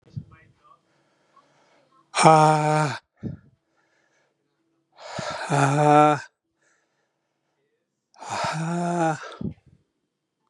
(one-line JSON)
{"exhalation_length": "10.5 s", "exhalation_amplitude": 30494, "exhalation_signal_mean_std_ratio": 0.36, "survey_phase": "beta (2021-08-13 to 2022-03-07)", "age": "45-64", "gender": "Male", "wearing_mask": "No", "symptom_cough_any": true, "symptom_sore_throat": true, "symptom_fatigue": true, "symptom_headache": true, "symptom_change_to_sense_of_smell_or_taste": true, "symptom_onset": "3 days", "smoker_status": "Never smoked", "respiratory_condition_asthma": false, "respiratory_condition_other": false, "recruitment_source": "Test and Trace", "submission_delay": "2 days", "covid_test_result": "Positive", "covid_test_method": "RT-qPCR"}